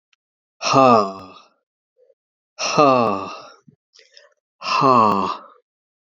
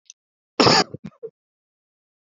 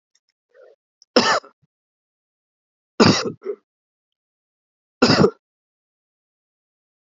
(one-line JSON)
{"exhalation_length": "6.1 s", "exhalation_amplitude": 29449, "exhalation_signal_mean_std_ratio": 0.42, "cough_length": "2.4 s", "cough_amplitude": 28394, "cough_signal_mean_std_ratio": 0.27, "three_cough_length": "7.1 s", "three_cough_amplitude": 32768, "three_cough_signal_mean_std_ratio": 0.26, "survey_phase": "beta (2021-08-13 to 2022-03-07)", "age": "65+", "gender": "Male", "wearing_mask": "No", "symptom_none": true, "symptom_onset": "12 days", "smoker_status": "Never smoked", "respiratory_condition_asthma": false, "respiratory_condition_other": false, "recruitment_source": "REACT", "submission_delay": "3 days", "covid_test_result": "Negative", "covid_test_method": "RT-qPCR", "influenza_a_test_result": "Negative", "influenza_b_test_result": "Negative"}